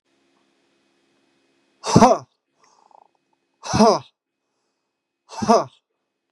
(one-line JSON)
{"exhalation_length": "6.3 s", "exhalation_amplitude": 32768, "exhalation_signal_mean_std_ratio": 0.26, "survey_phase": "beta (2021-08-13 to 2022-03-07)", "age": "45-64", "gender": "Male", "wearing_mask": "No", "symptom_none": true, "smoker_status": "Ex-smoker", "respiratory_condition_asthma": false, "respiratory_condition_other": false, "recruitment_source": "REACT", "submission_delay": "1 day", "covid_test_result": "Negative", "covid_test_method": "RT-qPCR", "influenza_a_test_result": "Negative", "influenza_b_test_result": "Negative"}